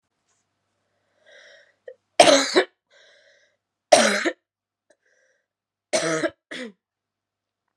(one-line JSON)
{"three_cough_length": "7.8 s", "three_cough_amplitude": 32767, "three_cough_signal_mean_std_ratio": 0.27, "survey_phase": "beta (2021-08-13 to 2022-03-07)", "age": "18-44", "gender": "Female", "wearing_mask": "No", "symptom_cough_any": true, "symptom_new_continuous_cough": true, "symptom_runny_or_blocked_nose": true, "symptom_shortness_of_breath": true, "symptom_headache": true, "symptom_change_to_sense_of_smell_or_taste": true, "symptom_onset": "4 days", "smoker_status": "Never smoked", "respiratory_condition_asthma": false, "respiratory_condition_other": false, "recruitment_source": "Test and Trace", "submission_delay": "2 days", "covid_test_result": "Positive", "covid_test_method": "ePCR"}